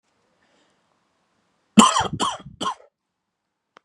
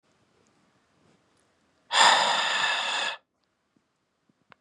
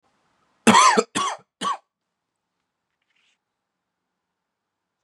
{"three_cough_length": "3.8 s", "three_cough_amplitude": 32768, "three_cough_signal_mean_std_ratio": 0.25, "exhalation_length": "4.6 s", "exhalation_amplitude": 17723, "exhalation_signal_mean_std_ratio": 0.39, "cough_length": "5.0 s", "cough_amplitude": 27395, "cough_signal_mean_std_ratio": 0.26, "survey_phase": "beta (2021-08-13 to 2022-03-07)", "age": "18-44", "gender": "Male", "wearing_mask": "No", "symptom_none": true, "smoker_status": "Current smoker (11 or more cigarettes per day)", "respiratory_condition_asthma": false, "respiratory_condition_other": false, "recruitment_source": "REACT", "submission_delay": "5 days", "covid_test_result": "Negative", "covid_test_method": "RT-qPCR", "influenza_a_test_result": "Negative", "influenza_b_test_result": "Negative"}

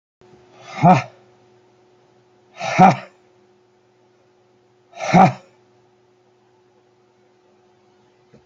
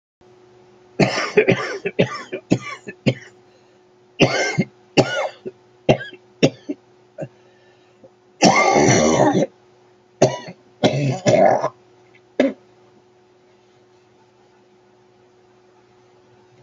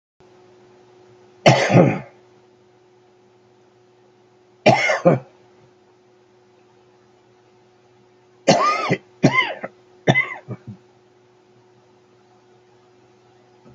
{"exhalation_length": "8.5 s", "exhalation_amplitude": 29963, "exhalation_signal_mean_std_ratio": 0.25, "cough_length": "16.6 s", "cough_amplitude": 32768, "cough_signal_mean_std_ratio": 0.4, "three_cough_length": "13.7 s", "three_cough_amplitude": 31134, "three_cough_signal_mean_std_ratio": 0.3, "survey_phase": "beta (2021-08-13 to 2022-03-07)", "age": "65+", "gender": "Male", "wearing_mask": "No", "symptom_cough_any": true, "symptom_new_continuous_cough": true, "symptom_runny_or_blocked_nose": true, "symptom_sore_throat": true, "symptom_onset": "3 days", "smoker_status": "Ex-smoker", "respiratory_condition_asthma": false, "respiratory_condition_other": true, "recruitment_source": "Test and Trace", "submission_delay": "1 day", "covid_test_result": "Positive", "covid_test_method": "ePCR"}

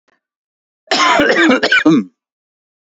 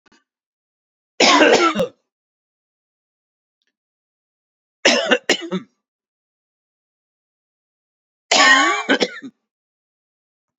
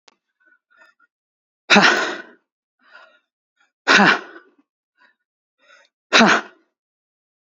{"cough_length": "3.0 s", "cough_amplitude": 32767, "cough_signal_mean_std_ratio": 0.53, "three_cough_length": "10.6 s", "three_cough_amplitude": 30574, "three_cough_signal_mean_std_ratio": 0.33, "exhalation_length": "7.6 s", "exhalation_amplitude": 29650, "exhalation_signal_mean_std_ratio": 0.29, "survey_phase": "beta (2021-08-13 to 2022-03-07)", "age": "45-64", "gender": "Male", "wearing_mask": "No", "symptom_cough_any": true, "symptom_fatigue": true, "smoker_status": "Ex-smoker", "respiratory_condition_asthma": false, "respiratory_condition_other": false, "recruitment_source": "Test and Trace", "submission_delay": "5 days", "covid_test_result": "Positive", "covid_test_method": "RT-qPCR", "covid_ct_value": 18.9, "covid_ct_gene": "ORF1ab gene", "covid_ct_mean": 19.6, "covid_viral_load": "380000 copies/ml", "covid_viral_load_category": "Low viral load (10K-1M copies/ml)"}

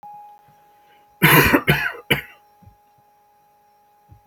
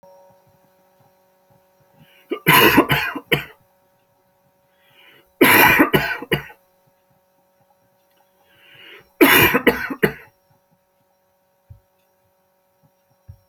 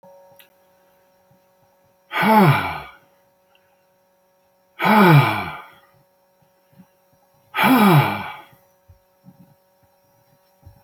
{"cough_length": "4.3 s", "cough_amplitude": 32768, "cough_signal_mean_std_ratio": 0.33, "three_cough_length": "13.5 s", "three_cough_amplitude": 32768, "three_cough_signal_mean_std_ratio": 0.32, "exhalation_length": "10.8 s", "exhalation_amplitude": 27122, "exhalation_signal_mean_std_ratio": 0.35, "survey_phase": "alpha (2021-03-01 to 2021-08-12)", "age": "65+", "gender": "Male", "wearing_mask": "No", "symptom_none": true, "smoker_status": "Never smoked", "respiratory_condition_asthma": false, "respiratory_condition_other": false, "recruitment_source": "REACT", "submission_delay": "1 day", "covid_test_result": "Negative", "covid_test_method": "RT-qPCR"}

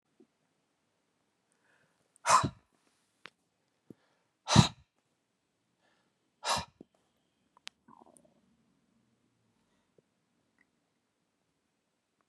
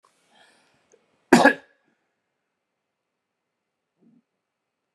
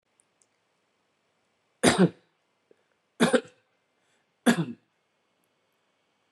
{"exhalation_length": "12.3 s", "exhalation_amplitude": 14491, "exhalation_signal_mean_std_ratio": 0.15, "cough_length": "4.9 s", "cough_amplitude": 32767, "cough_signal_mean_std_ratio": 0.15, "three_cough_length": "6.3 s", "three_cough_amplitude": 20149, "three_cough_signal_mean_std_ratio": 0.24, "survey_phase": "beta (2021-08-13 to 2022-03-07)", "age": "45-64", "gender": "Male", "wearing_mask": "No", "symptom_runny_or_blocked_nose": true, "smoker_status": "Ex-smoker", "respiratory_condition_asthma": true, "respiratory_condition_other": false, "recruitment_source": "REACT", "submission_delay": "1 day", "covid_test_result": "Negative", "covid_test_method": "RT-qPCR"}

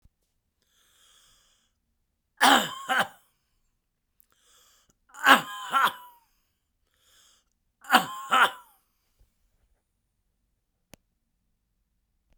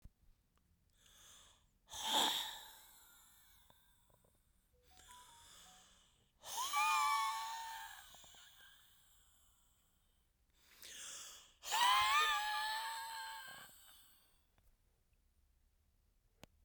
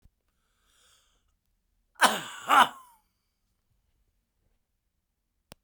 {"three_cough_length": "12.4 s", "three_cough_amplitude": 30981, "three_cough_signal_mean_std_ratio": 0.24, "exhalation_length": "16.6 s", "exhalation_amplitude": 3039, "exhalation_signal_mean_std_ratio": 0.41, "cough_length": "5.6 s", "cough_amplitude": 18233, "cough_signal_mean_std_ratio": 0.2, "survey_phase": "beta (2021-08-13 to 2022-03-07)", "age": "65+", "gender": "Male", "wearing_mask": "No", "symptom_runny_or_blocked_nose": true, "symptom_fatigue": true, "symptom_onset": "3 days", "smoker_status": "Never smoked", "respiratory_condition_asthma": false, "respiratory_condition_other": false, "recruitment_source": "Test and Trace", "submission_delay": "1 day", "covid_test_result": "Positive", "covid_test_method": "ePCR"}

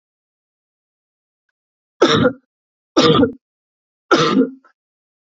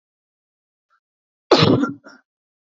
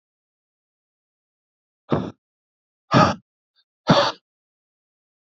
{"three_cough_length": "5.4 s", "three_cough_amplitude": 30108, "three_cough_signal_mean_std_ratio": 0.35, "cough_length": "2.6 s", "cough_amplitude": 28156, "cough_signal_mean_std_ratio": 0.3, "exhalation_length": "5.4 s", "exhalation_amplitude": 32508, "exhalation_signal_mean_std_ratio": 0.25, "survey_phase": "beta (2021-08-13 to 2022-03-07)", "age": "18-44", "gender": "Male", "wearing_mask": "No", "symptom_none": true, "smoker_status": "Current smoker (e-cigarettes or vapes only)", "respiratory_condition_asthma": false, "respiratory_condition_other": false, "recruitment_source": "Test and Trace", "submission_delay": "1 day", "covid_test_result": "Positive", "covid_test_method": "RT-qPCR", "covid_ct_value": 28.5, "covid_ct_gene": "ORF1ab gene"}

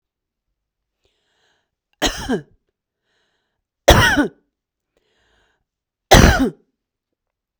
{"three_cough_length": "7.6 s", "three_cough_amplitude": 32768, "three_cough_signal_mean_std_ratio": 0.27, "survey_phase": "beta (2021-08-13 to 2022-03-07)", "age": "45-64", "gender": "Female", "wearing_mask": "No", "symptom_none": true, "smoker_status": "Never smoked", "respiratory_condition_asthma": false, "respiratory_condition_other": false, "recruitment_source": "REACT", "submission_delay": "1 day", "covid_test_result": "Negative", "covid_test_method": "RT-qPCR", "influenza_a_test_result": "Unknown/Void", "influenza_b_test_result": "Unknown/Void"}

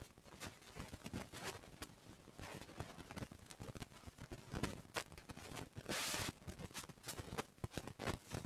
{"three_cough_length": "8.5 s", "three_cough_amplitude": 1885, "three_cough_signal_mean_std_ratio": 0.61, "survey_phase": "beta (2021-08-13 to 2022-03-07)", "age": "65+", "gender": "Male", "wearing_mask": "No", "symptom_none": true, "smoker_status": "Ex-smoker", "respiratory_condition_asthma": false, "respiratory_condition_other": false, "recruitment_source": "REACT", "submission_delay": "4 days", "covid_test_result": "Negative", "covid_test_method": "RT-qPCR", "influenza_a_test_result": "Negative", "influenza_b_test_result": "Negative"}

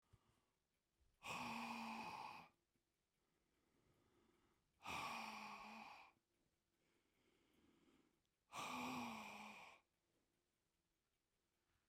{"exhalation_length": "11.9 s", "exhalation_amplitude": 420, "exhalation_signal_mean_std_ratio": 0.48, "survey_phase": "beta (2021-08-13 to 2022-03-07)", "age": "65+", "gender": "Male", "wearing_mask": "No", "symptom_none": true, "smoker_status": "Ex-smoker", "respiratory_condition_asthma": false, "respiratory_condition_other": false, "recruitment_source": "REACT", "submission_delay": "2 days", "covid_test_result": "Negative", "covid_test_method": "RT-qPCR"}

